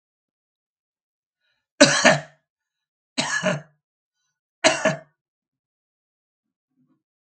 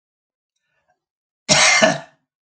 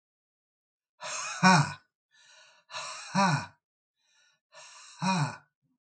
{
  "three_cough_length": "7.3 s",
  "three_cough_amplitude": 32768,
  "three_cough_signal_mean_std_ratio": 0.25,
  "cough_length": "2.5 s",
  "cough_amplitude": 32768,
  "cough_signal_mean_std_ratio": 0.36,
  "exhalation_length": "5.9 s",
  "exhalation_amplitude": 12787,
  "exhalation_signal_mean_std_ratio": 0.36,
  "survey_phase": "beta (2021-08-13 to 2022-03-07)",
  "age": "65+",
  "gender": "Male",
  "wearing_mask": "No",
  "symptom_none": true,
  "smoker_status": "Ex-smoker",
  "respiratory_condition_asthma": false,
  "respiratory_condition_other": false,
  "recruitment_source": "REACT",
  "submission_delay": "1 day",
  "covid_test_result": "Negative",
  "covid_test_method": "RT-qPCR",
  "influenza_a_test_result": "Negative",
  "influenza_b_test_result": "Negative"
}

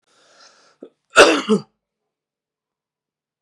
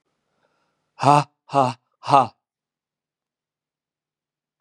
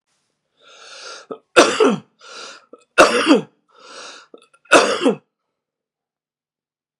{
  "cough_length": "3.4 s",
  "cough_amplitude": 32768,
  "cough_signal_mean_std_ratio": 0.24,
  "exhalation_length": "4.6 s",
  "exhalation_amplitude": 32114,
  "exhalation_signal_mean_std_ratio": 0.24,
  "three_cough_length": "7.0 s",
  "three_cough_amplitude": 32768,
  "three_cough_signal_mean_std_ratio": 0.33,
  "survey_phase": "beta (2021-08-13 to 2022-03-07)",
  "age": "45-64",
  "gender": "Male",
  "wearing_mask": "No",
  "symptom_cough_any": true,
  "smoker_status": "Never smoked",
  "respiratory_condition_asthma": true,
  "respiratory_condition_other": false,
  "recruitment_source": "REACT",
  "submission_delay": "3 days",
  "covid_test_result": "Negative",
  "covid_test_method": "RT-qPCR",
  "influenza_a_test_result": "Unknown/Void",
  "influenza_b_test_result": "Unknown/Void"
}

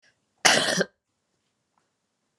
{
  "cough_length": "2.4 s",
  "cough_amplitude": 32767,
  "cough_signal_mean_std_ratio": 0.29,
  "survey_phase": "beta (2021-08-13 to 2022-03-07)",
  "age": "18-44",
  "gender": "Female",
  "wearing_mask": "No",
  "symptom_runny_or_blocked_nose": true,
  "symptom_fatigue": true,
  "symptom_headache": true,
  "symptom_onset": "3 days",
  "smoker_status": "Never smoked",
  "respiratory_condition_asthma": false,
  "respiratory_condition_other": false,
  "recruitment_source": "Test and Trace",
  "submission_delay": "1 day",
  "covid_test_result": "Positive",
  "covid_test_method": "ePCR"
}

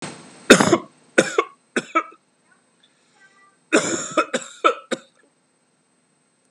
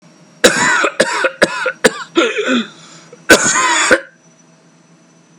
{
  "three_cough_length": "6.5 s",
  "three_cough_amplitude": 32768,
  "three_cough_signal_mean_std_ratio": 0.31,
  "cough_length": "5.4 s",
  "cough_amplitude": 32768,
  "cough_signal_mean_std_ratio": 0.54,
  "survey_phase": "beta (2021-08-13 to 2022-03-07)",
  "age": "18-44",
  "gender": "Male",
  "wearing_mask": "Yes",
  "symptom_none": true,
  "smoker_status": "Never smoked",
  "respiratory_condition_asthma": false,
  "respiratory_condition_other": false,
  "recruitment_source": "REACT",
  "submission_delay": "5 days",
  "covid_test_result": "Negative",
  "covid_test_method": "RT-qPCR"
}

